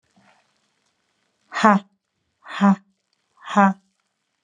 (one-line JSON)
{"exhalation_length": "4.4 s", "exhalation_amplitude": 30033, "exhalation_signal_mean_std_ratio": 0.29, "survey_phase": "alpha (2021-03-01 to 2021-08-12)", "age": "45-64", "gender": "Female", "wearing_mask": "No", "symptom_none": true, "smoker_status": "Ex-smoker", "respiratory_condition_asthma": false, "respiratory_condition_other": false, "recruitment_source": "REACT", "submission_delay": "5 days", "covid_test_result": "Negative", "covid_test_method": "RT-qPCR"}